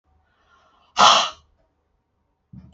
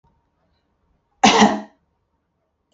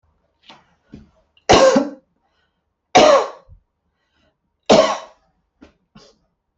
{"exhalation_length": "2.7 s", "exhalation_amplitude": 29112, "exhalation_signal_mean_std_ratio": 0.27, "cough_length": "2.7 s", "cough_amplitude": 28038, "cough_signal_mean_std_ratio": 0.28, "three_cough_length": "6.6 s", "three_cough_amplitude": 31887, "three_cough_signal_mean_std_ratio": 0.31, "survey_phase": "beta (2021-08-13 to 2022-03-07)", "age": "45-64", "gender": "Female", "wearing_mask": "No", "symptom_cough_any": true, "symptom_other": true, "smoker_status": "Never smoked", "respiratory_condition_asthma": false, "respiratory_condition_other": false, "recruitment_source": "Test and Trace", "submission_delay": "1 day", "covid_test_result": "Positive", "covid_test_method": "RT-qPCR", "covid_ct_value": 32.6, "covid_ct_gene": "ORF1ab gene", "covid_ct_mean": 33.3, "covid_viral_load": "12 copies/ml", "covid_viral_load_category": "Minimal viral load (< 10K copies/ml)"}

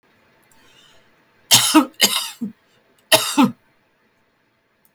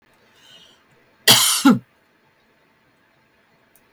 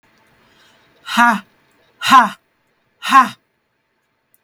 {"three_cough_length": "4.9 s", "three_cough_amplitude": 32768, "three_cough_signal_mean_std_ratio": 0.32, "cough_length": "3.9 s", "cough_amplitude": 32768, "cough_signal_mean_std_ratio": 0.27, "exhalation_length": "4.4 s", "exhalation_amplitude": 32768, "exhalation_signal_mean_std_ratio": 0.31, "survey_phase": "beta (2021-08-13 to 2022-03-07)", "age": "65+", "gender": "Female", "wearing_mask": "No", "symptom_none": true, "smoker_status": "Ex-smoker", "respiratory_condition_asthma": false, "respiratory_condition_other": false, "recruitment_source": "REACT", "submission_delay": "1 day", "covid_test_result": "Negative", "covid_test_method": "RT-qPCR", "influenza_a_test_result": "Negative", "influenza_b_test_result": "Negative"}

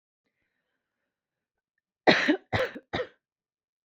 {"cough_length": "3.8 s", "cough_amplitude": 21974, "cough_signal_mean_std_ratio": 0.28, "survey_phase": "beta (2021-08-13 to 2022-03-07)", "age": "18-44", "gender": "Female", "wearing_mask": "No", "symptom_runny_or_blocked_nose": true, "symptom_sore_throat": true, "smoker_status": "Never smoked", "respiratory_condition_asthma": false, "respiratory_condition_other": false, "recruitment_source": "Test and Trace", "submission_delay": "2 days", "covid_test_result": "Negative", "covid_test_method": "RT-qPCR"}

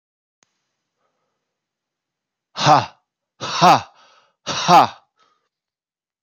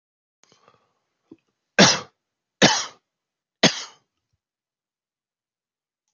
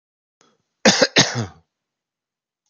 {"exhalation_length": "6.2 s", "exhalation_amplitude": 32749, "exhalation_signal_mean_std_ratio": 0.28, "three_cough_length": "6.1 s", "three_cough_amplitude": 32554, "three_cough_signal_mean_std_ratio": 0.21, "cough_length": "2.7 s", "cough_amplitude": 31897, "cough_signal_mean_std_ratio": 0.3, "survey_phase": "beta (2021-08-13 to 2022-03-07)", "age": "45-64", "gender": "Male", "wearing_mask": "No", "symptom_runny_or_blocked_nose": true, "symptom_headache": true, "smoker_status": "Ex-smoker", "respiratory_condition_asthma": false, "respiratory_condition_other": false, "recruitment_source": "Test and Trace", "submission_delay": "2 days", "covid_test_result": "Positive", "covid_test_method": "LFT"}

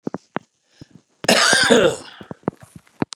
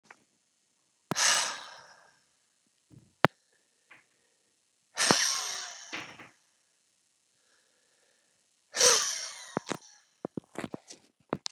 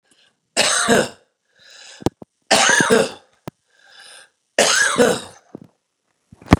{"cough_length": "3.2 s", "cough_amplitude": 32590, "cough_signal_mean_std_ratio": 0.4, "exhalation_length": "11.5 s", "exhalation_amplitude": 27745, "exhalation_signal_mean_std_ratio": 0.29, "three_cough_length": "6.6 s", "three_cough_amplitude": 32768, "three_cough_signal_mean_std_ratio": 0.41, "survey_phase": "beta (2021-08-13 to 2022-03-07)", "age": "65+", "gender": "Male", "wearing_mask": "No", "symptom_none": true, "smoker_status": "Ex-smoker", "respiratory_condition_asthma": false, "respiratory_condition_other": false, "recruitment_source": "REACT", "submission_delay": "0 days", "covid_test_result": "Negative", "covid_test_method": "RT-qPCR"}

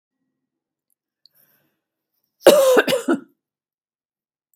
{"cough_length": "4.6 s", "cough_amplitude": 32768, "cough_signal_mean_std_ratio": 0.28, "survey_phase": "beta (2021-08-13 to 2022-03-07)", "age": "65+", "gender": "Female", "wearing_mask": "No", "symptom_none": true, "smoker_status": "Ex-smoker", "respiratory_condition_asthma": false, "respiratory_condition_other": false, "recruitment_source": "REACT", "submission_delay": "8 days", "covid_test_result": "Negative", "covid_test_method": "RT-qPCR", "influenza_a_test_result": "Negative", "influenza_b_test_result": "Negative"}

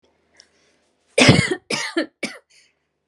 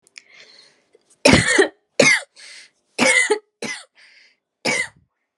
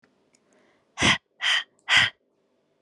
{"cough_length": "3.1 s", "cough_amplitude": 32768, "cough_signal_mean_std_ratio": 0.33, "three_cough_length": "5.4 s", "three_cough_amplitude": 32768, "three_cough_signal_mean_std_ratio": 0.39, "exhalation_length": "2.8 s", "exhalation_amplitude": 19268, "exhalation_signal_mean_std_ratio": 0.36, "survey_phase": "alpha (2021-03-01 to 2021-08-12)", "age": "18-44", "gender": "Female", "wearing_mask": "No", "symptom_none": true, "symptom_onset": "12 days", "smoker_status": "Never smoked", "respiratory_condition_asthma": false, "respiratory_condition_other": false, "recruitment_source": "REACT", "submission_delay": "0 days", "covid_test_result": "Negative", "covid_test_method": "RT-qPCR"}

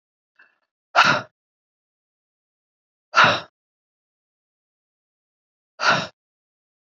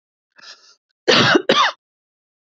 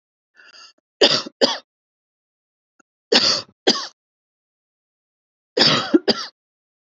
{"exhalation_length": "7.0 s", "exhalation_amplitude": 27769, "exhalation_signal_mean_std_ratio": 0.24, "cough_length": "2.6 s", "cough_amplitude": 28068, "cough_signal_mean_std_ratio": 0.38, "three_cough_length": "7.0 s", "three_cough_amplitude": 29941, "three_cough_signal_mean_std_ratio": 0.32, "survey_phase": "beta (2021-08-13 to 2022-03-07)", "age": "45-64", "gender": "Female", "wearing_mask": "No", "symptom_cough_any": true, "symptom_runny_or_blocked_nose": true, "symptom_onset": "12 days", "smoker_status": "Ex-smoker", "respiratory_condition_asthma": false, "respiratory_condition_other": false, "recruitment_source": "REACT", "submission_delay": "4 days", "covid_test_result": "Negative", "covid_test_method": "RT-qPCR", "influenza_a_test_result": "Negative", "influenza_b_test_result": "Negative"}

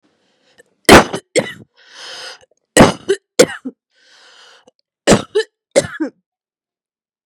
{"three_cough_length": "7.3 s", "three_cough_amplitude": 32768, "three_cough_signal_mean_std_ratio": 0.29, "survey_phase": "beta (2021-08-13 to 2022-03-07)", "age": "18-44", "gender": "Female", "wearing_mask": "No", "symptom_cough_any": true, "symptom_sore_throat": true, "symptom_onset": "10 days", "smoker_status": "Ex-smoker", "respiratory_condition_asthma": false, "respiratory_condition_other": false, "recruitment_source": "REACT", "submission_delay": "2 days", "covid_test_result": "Negative", "covid_test_method": "RT-qPCR", "influenza_a_test_result": "Negative", "influenza_b_test_result": "Negative"}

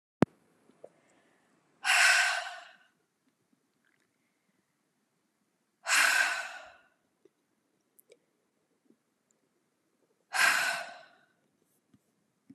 {"exhalation_length": "12.5 s", "exhalation_amplitude": 15781, "exhalation_signal_mean_std_ratio": 0.29, "survey_phase": "beta (2021-08-13 to 2022-03-07)", "age": "18-44", "gender": "Female", "wearing_mask": "No", "symptom_cough_any": true, "symptom_runny_or_blocked_nose": true, "symptom_shortness_of_breath": true, "symptom_sore_throat": true, "symptom_change_to_sense_of_smell_or_taste": true, "symptom_other": true, "symptom_onset": "2 days", "smoker_status": "Ex-smoker", "respiratory_condition_asthma": false, "respiratory_condition_other": false, "recruitment_source": "Test and Trace", "submission_delay": "2 days", "covid_test_result": "Positive", "covid_test_method": "ePCR"}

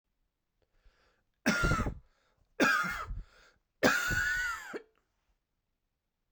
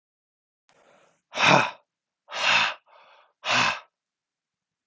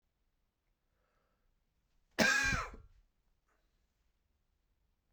{"three_cough_length": "6.3 s", "three_cough_amplitude": 10645, "three_cough_signal_mean_std_ratio": 0.44, "exhalation_length": "4.9 s", "exhalation_amplitude": 24293, "exhalation_signal_mean_std_ratio": 0.36, "cough_length": "5.1 s", "cough_amplitude": 5821, "cough_signal_mean_std_ratio": 0.25, "survey_phase": "beta (2021-08-13 to 2022-03-07)", "age": "18-44", "gender": "Male", "wearing_mask": "No", "symptom_cough_any": true, "symptom_runny_or_blocked_nose": true, "symptom_sore_throat": true, "symptom_fatigue": true, "symptom_headache": true, "symptom_change_to_sense_of_smell_or_taste": true, "symptom_onset": "5 days", "smoker_status": "Ex-smoker", "respiratory_condition_asthma": false, "respiratory_condition_other": false, "recruitment_source": "Test and Trace", "submission_delay": "1 day", "covid_test_result": "Positive", "covid_test_method": "RT-qPCR"}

